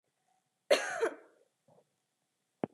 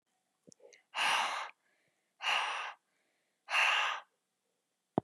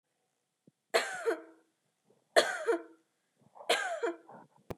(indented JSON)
{
  "cough_length": "2.7 s",
  "cough_amplitude": 9875,
  "cough_signal_mean_std_ratio": 0.27,
  "exhalation_length": "5.0 s",
  "exhalation_amplitude": 7090,
  "exhalation_signal_mean_std_ratio": 0.44,
  "three_cough_length": "4.8 s",
  "three_cough_amplitude": 11346,
  "three_cough_signal_mean_std_ratio": 0.37,
  "survey_phase": "beta (2021-08-13 to 2022-03-07)",
  "age": "18-44",
  "gender": "Female",
  "wearing_mask": "No",
  "symptom_none": true,
  "smoker_status": "Never smoked",
  "respiratory_condition_asthma": false,
  "respiratory_condition_other": false,
  "recruitment_source": "REACT",
  "submission_delay": "1 day",
  "covid_test_result": "Negative",
  "covid_test_method": "RT-qPCR",
  "influenza_a_test_result": "Negative",
  "influenza_b_test_result": "Negative"
}